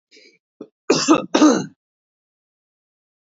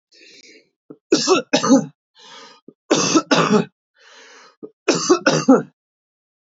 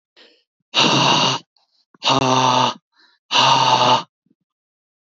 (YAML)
cough_length: 3.2 s
cough_amplitude: 28197
cough_signal_mean_std_ratio: 0.33
three_cough_length: 6.5 s
three_cough_amplitude: 27662
three_cough_signal_mean_std_ratio: 0.42
exhalation_length: 5.0 s
exhalation_amplitude: 29124
exhalation_signal_mean_std_ratio: 0.56
survey_phase: beta (2021-08-13 to 2022-03-07)
age: 18-44
gender: Male
wearing_mask: 'No'
symptom_none: true
smoker_status: Ex-smoker
respiratory_condition_asthma: false
respiratory_condition_other: false
recruitment_source: Test and Trace
submission_delay: 2 days
covid_test_result: Positive
covid_test_method: RT-qPCR
covid_ct_value: 30.3
covid_ct_gene: ORF1ab gene